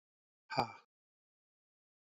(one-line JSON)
{"exhalation_length": "2.0 s", "exhalation_amplitude": 5085, "exhalation_signal_mean_std_ratio": 0.19, "survey_phase": "alpha (2021-03-01 to 2021-08-12)", "age": "45-64", "gender": "Male", "wearing_mask": "No", "symptom_cough_any": true, "symptom_shortness_of_breath": true, "symptom_abdominal_pain": true, "symptom_loss_of_taste": true, "symptom_onset": "4 days", "smoker_status": "Never smoked", "respiratory_condition_asthma": false, "respiratory_condition_other": false, "recruitment_source": "Test and Trace", "submission_delay": "2 days", "covid_test_result": "Positive", "covid_test_method": "RT-qPCR", "covid_ct_value": 13.1, "covid_ct_gene": "ORF1ab gene", "covid_ct_mean": 13.3, "covid_viral_load": "44000000 copies/ml", "covid_viral_load_category": "High viral load (>1M copies/ml)"}